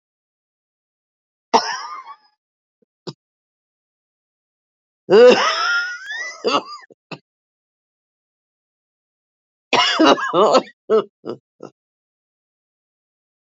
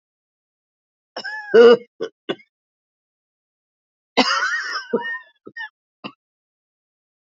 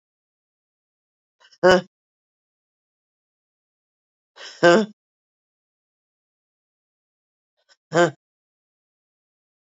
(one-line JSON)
{"three_cough_length": "13.6 s", "three_cough_amplitude": 31951, "three_cough_signal_mean_std_ratio": 0.31, "cough_length": "7.3 s", "cough_amplitude": 30387, "cough_signal_mean_std_ratio": 0.28, "exhalation_length": "9.7 s", "exhalation_amplitude": 27374, "exhalation_signal_mean_std_ratio": 0.18, "survey_phase": "beta (2021-08-13 to 2022-03-07)", "age": "45-64", "gender": "Female", "wearing_mask": "No", "symptom_cough_any": true, "symptom_new_continuous_cough": true, "symptom_runny_or_blocked_nose": true, "symptom_shortness_of_breath": true, "symptom_fatigue": true, "symptom_fever_high_temperature": true, "symptom_headache": true, "symptom_change_to_sense_of_smell_or_taste": true, "symptom_onset": "3 days", "smoker_status": "Prefer not to say", "respiratory_condition_asthma": true, "respiratory_condition_other": false, "recruitment_source": "Test and Trace", "submission_delay": "1 day", "covid_test_result": "Positive", "covid_test_method": "RT-qPCR", "covid_ct_value": 22.5, "covid_ct_gene": "ORF1ab gene", "covid_ct_mean": 22.9, "covid_viral_load": "32000 copies/ml", "covid_viral_load_category": "Low viral load (10K-1M copies/ml)"}